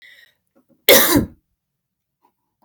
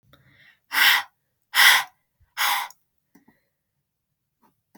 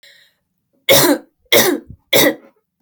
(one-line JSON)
{"cough_length": "2.6 s", "cough_amplitude": 32768, "cough_signal_mean_std_ratio": 0.29, "exhalation_length": "4.8 s", "exhalation_amplitude": 25381, "exhalation_signal_mean_std_ratio": 0.32, "three_cough_length": "2.8 s", "three_cough_amplitude": 32768, "three_cough_signal_mean_std_ratio": 0.44, "survey_phase": "beta (2021-08-13 to 2022-03-07)", "age": "18-44", "gender": "Female", "wearing_mask": "No", "symptom_none": true, "smoker_status": "Never smoked", "respiratory_condition_asthma": false, "respiratory_condition_other": false, "recruitment_source": "REACT", "submission_delay": "1 day", "covid_test_result": "Negative", "covid_test_method": "RT-qPCR"}